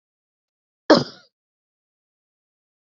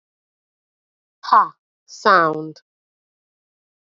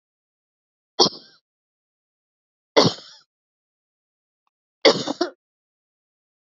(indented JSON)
{
  "cough_length": "2.9 s",
  "cough_amplitude": 27846,
  "cough_signal_mean_std_ratio": 0.15,
  "exhalation_length": "3.9 s",
  "exhalation_amplitude": 30709,
  "exhalation_signal_mean_std_ratio": 0.27,
  "three_cough_length": "6.6 s",
  "three_cough_amplitude": 28469,
  "three_cough_signal_mean_std_ratio": 0.2,
  "survey_phase": "alpha (2021-03-01 to 2021-08-12)",
  "age": "18-44",
  "gender": "Female",
  "wearing_mask": "No",
  "symptom_cough_any": true,
  "symptom_fatigue": true,
  "symptom_loss_of_taste": true,
  "symptom_onset": "3 days",
  "smoker_status": "Never smoked",
  "respiratory_condition_asthma": false,
  "respiratory_condition_other": false,
  "recruitment_source": "Test and Trace",
  "submission_delay": "1 day",
  "covid_test_result": "Positive",
  "covid_test_method": "RT-qPCR",
  "covid_ct_value": 14.2,
  "covid_ct_gene": "ORF1ab gene",
  "covid_ct_mean": 14.7,
  "covid_viral_load": "15000000 copies/ml",
  "covid_viral_load_category": "High viral load (>1M copies/ml)"
}